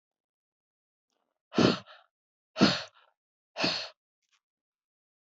{"exhalation_length": "5.4 s", "exhalation_amplitude": 12959, "exhalation_signal_mean_std_ratio": 0.26, "survey_phase": "beta (2021-08-13 to 2022-03-07)", "age": "45-64", "gender": "Female", "wearing_mask": "No", "symptom_none": true, "symptom_onset": "12 days", "smoker_status": "Never smoked", "respiratory_condition_asthma": false, "respiratory_condition_other": false, "recruitment_source": "REACT", "submission_delay": "1 day", "covid_test_result": "Negative", "covid_test_method": "RT-qPCR"}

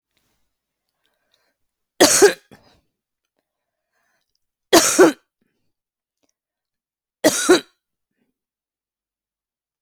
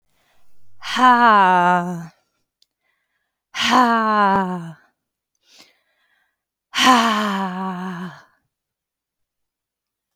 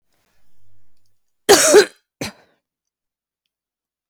{"three_cough_length": "9.8 s", "three_cough_amplitude": 32768, "three_cough_signal_mean_std_ratio": 0.24, "exhalation_length": "10.2 s", "exhalation_amplitude": 31164, "exhalation_signal_mean_std_ratio": 0.46, "cough_length": "4.1 s", "cough_amplitude": 32768, "cough_signal_mean_std_ratio": 0.27, "survey_phase": "beta (2021-08-13 to 2022-03-07)", "age": "65+", "gender": "Female", "wearing_mask": "No", "symptom_runny_or_blocked_nose": true, "symptom_fatigue": true, "smoker_status": "Never smoked", "respiratory_condition_asthma": false, "respiratory_condition_other": false, "recruitment_source": "Test and Trace", "submission_delay": "2 days", "covid_test_result": "Positive", "covid_test_method": "RT-qPCR"}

